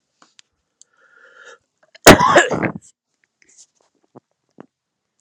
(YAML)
cough_length: 5.2 s
cough_amplitude: 32768
cough_signal_mean_std_ratio: 0.23
survey_phase: alpha (2021-03-01 to 2021-08-12)
age: 45-64
gender: Male
wearing_mask: 'No'
symptom_headache: true
smoker_status: Never smoked
respiratory_condition_asthma: false
respiratory_condition_other: false
recruitment_source: Test and Trace
submission_delay: 2 days
covid_test_result: Positive
covid_test_method: RT-qPCR
covid_ct_value: 13.4
covid_ct_gene: N gene
covid_ct_mean: 13.8
covid_viral_load: 29000000 copies/ml
covid_viral_load_category: High viral load (>1M copies/ml)